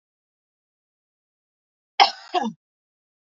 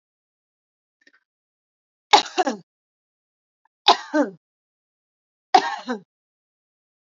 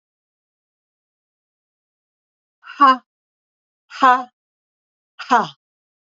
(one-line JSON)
{"cough_length": "3.3 s", "cough_amplitude": 31149, "cough_signal_mean_std_ratio": 0.19, "three_cough_length": "7.2 s", "three_cough_amplitude": 30953, "three_cough_signal_mean_std_ratio": 0.22, "exhalation_length": "6.1 s", "exhalation_amplitude": 31500, "exhalation_signal_mean_std_ratio": 0.23, "survey_phase": "alpha (2021-03-01 to 2021-08-12)", "age": "45-64", "gender": "Female", "wearing_mask": "No", "symptom_none": true, "smoker_status": "Never smoked", "respiratory_condition_asthma": true, "respiratory_condition_other": false, "recruitment_source": "REACT", "submission_delay": "1 day", "covid_test_result": "Negative", "covid_test_method": "RT-qPCR"}